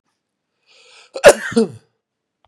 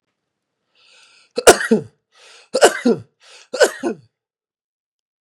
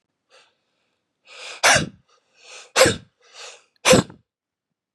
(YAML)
cough_length: 2.5 s
cough_amplitude: 32768
cough_signal_mean_std_ratio: 0.24
three_cough_length: 5.2 s
three_cough_amplitude: 32768
three_cough_signal_mean_std_ratio: 0.28
exhalation_length: 4.9 s
exhalation_amplitude: 29415
exhalation_signal_mean_std_ratio: 0.29
survey_phase: beta (2021-08-13 to 2022-03-07)
age: 45-64
gender: Male
wearing_mask: 'No'
symptom_runny_or_blocked_nose: true
symptom_sore_throat: true
symptom_onset: 2 days
smoker_status: Ex-smoker
respiratory_condition_asthma: true
respiratory_condition_other: false
recruitment_source: Test and Trace
submission_delay: 1 day
covid_test_result: Positive
covid_test_method: RT-qPCR
covid_ct_value: 23.9
covid_ct_gene: ORF1ab gene
covid_ct_mean: 24.1
covid_viral_load: 13000 copies/ml
covid_viral_load_category: Low viral load (10K-1M copies/ml)